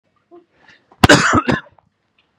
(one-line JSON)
{"cough_length": "2.4 s", "cough_amplitude": 32768, "cough_signal_mean_std_ratio": 0.33, "survey_phase": "beta (2021-08-13 to 2022-03-07)", "age": "18-44", "gender": "Male", "wearing_mask": "No", "symptom_none": true, "smoker_status": "Ex-smoker", "respiratory_condition_asthma": true, "respiratory_condition_other": false, "recruitment_source": "REACT", "submission_delay": "1 day", "covid_test_result": "Negative", "covid_test_method": "RT-qPCR", "influenza_a_test_result": "Negative", "influenza_b_test_result": "Negative"}